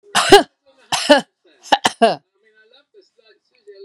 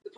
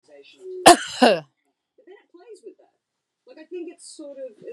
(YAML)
three_cough_length: 3.8 s
three_cough_amplitude: 32768
three_cough_signal_mean_std_ratio: 0.32
exhalation_length: 0.2 s
exhalation_amplitude: 1082
exhalation_signal_mean_std_ratio: 0.51
cough_length: 4.5 s
cough_amplitude: 32768
cough_signal_mean_std_ratio: 0.25
survey_phase: beta (2021-08-13 to 2022-03-07)
age: 45-64
gender: Female
wearing_mask: 'No'
symptom_none: true
smoker_status: Never smoked
respiratory_condition_asthma: false
respiratory_condition_other: false
recruitment_source: REACT
submission_delay: 2 days
covid_test_result: Negative
covid_test_method: RT-qPCR
influenza_a_test_result: Negative
influenza_b_test_result: Negative